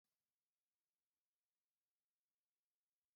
{"three_cough_length": "3.2 s", "three_cough_amplitude": 3, "three_cough_signal_mean_std_ratio": 0.29, "survey_phase": "beta (2021-08-13 to 2022-03-07)", "age": "18-44", "gender": "Female", "wearing_mask": "No", "symptom_none": true, "smoker_status": "Never smoked", "respiratory_condition_asthma": false, "respiratory_condition_other": false, "recruitment_source": "REACT", "submission_delay": "2 days", "covid_test_result": "Negative", "covid_test_method": "RT-qPCR", "influenza_a_test_result": "Negative", "influenza_b_test_result": "Negative"}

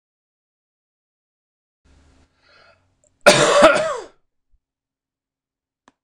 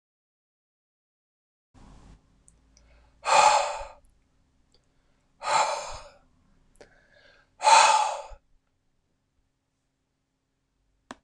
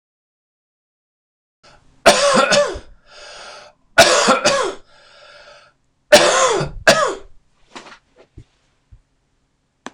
{"cough_length": "6.0 s", "cough_amplitude": 26028, "cough_signal_mean_std_ratio": 0.26, "exhalation_length": "11.2 s", "exhalation_amplitude": 19131, "exhalation_signal_mean_std_ratio": 0.28, "three_cough_length": "9.9 s", "three_cough_amplitude": 26028, "three_cough_signal_mean_std_ratio": 0.39, "survey_phase": "beta (2021-08-13 to 2022-03-07)", "age": "45-64", "gender": "Male", "wearing_mask": "No", "symptom_cough_any": true, "symptom_runny_or_blocked_nose": true, "smoker_status": "Never smoked", "respiratory_condition_asthma": false, "respiratory_condition_other": false, "recruitment_source": "REACT", "submission_delay": "1 day", "covid_test_result": "Negative", "covid_test_method": "RT-qPCR"}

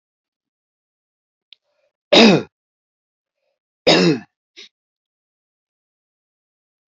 {"cough_length": "7.0 s", "cough_amplitude": 31229, "cough_signal_mean_std_ratio": 0.23, "survey_phase": "alpha (2021-03-01 to 2021-08-12)", "age": "65+", "gender": "Male", "wearing_mask": "No", "symptom_fatigue": true, "smoker_status": "Never smoked", "respiratory_condition_asthma": false, "respiratory_condition_other": false, "recruitment_source": "REACT", "submission_delay": "2 days", "covid_test_method": "RT-qPCR"}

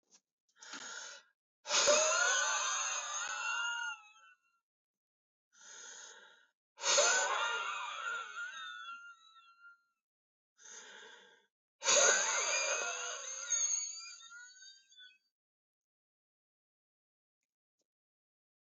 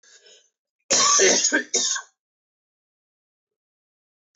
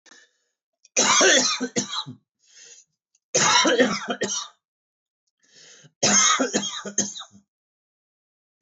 {"exhalation_length": "18.8 s", "exhalation_amplitude": 5663, "exhalation_signal_mean_std_ratio": 0.47, "cough_length": "4.4 s", "cough_amplitude": 16745, "cough_signal_mean_std_ratio": 0.39, "three_cough_length": "8.6 s", "three_cough_amplitude": 17831, "three_cough_signal_mean_std_ratio": 0.46, "survey_phase": "beta (2021-08-13 to 2022-03-07)", "age": "45-64", "gender": "Male", "wearing_mask": "No", "symptom_cough_any": true, "symptom_runny_or_blocked_nose": true, "symptom_shortness_of_breath": true, "symptom_fatigue": true, "symptom_change_to_sense_of_smell_or_taste": true, "symptom_onset": "12 days", "smoker_status": "Ex-smoker", "respiratory_condition_asthma": false, "respiratory_condition_other": false, "recruitment_source": "REACT", "submission_delay": "2 days", "covid_test_result": "Negative", "covid_test_method": "RT-qPCR"}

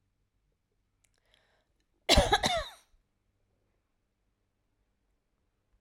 {"cough_length": "5.8 s", "cough_amplitude": 13403, "cough_signal_mean_std_ratio": 0.22, "survey_phase": "alpha (2021-03-01 to 2021-08-12)", "age": "45-64", "gender": "Female", "wearing_mask": "No", "symptom_abdominal_pain": true, "symptom_onset": "12 days", "smoker_status": "Never smoked", "respiratory_condition_asthma": false, "respiratory_condition_other": false, "recruitment_source": "REACT", "submission_delay": "1 day", "covid_test_result": "Negative", "covid_test_method": "RT-qPCR"}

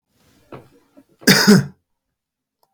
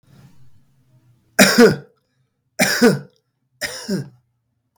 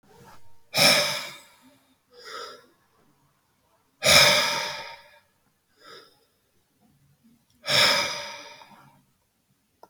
{"cough_length": "2.7 s", "cough_amplitude": 32768, "cough_signal_mean_std_ratio": 0.3, "three_cough_length": "4.8 s", "three_cough_amplitude": 32768, "three_cough_signal_mean_std_ratio": 0.34, "exhalation_length": "9.9 s", "exhalation_amplitude": 30454, "exhalation_signal_mean_std_ratio": 0.34, "survey_phase": "beta (2021-08-13 to 2022-03-07)", "age": "45-64", "gender": "Male", "wearing_mask": "No", "symptom_runny_or_blocked_nose": true, "symptom_onset": "3 days", "smoker_status": "Never smoked", "respiratory_condition_asthma": true, "respiratory_condition_other": false, "recruitment_source": "Test and Trace", "submission_delay": "2 days", "covid_test_result": "Positive", "covid_test_method": "RT-qPCR", "covid_ct_value": 16.1, "covid_ct_gene": "N gene", "covid_ct_mean": 16.4, "covid_viral_load": "4200000 copies/ml", "covid_viral_load_category": "High viral load (>1M copies/ml)"}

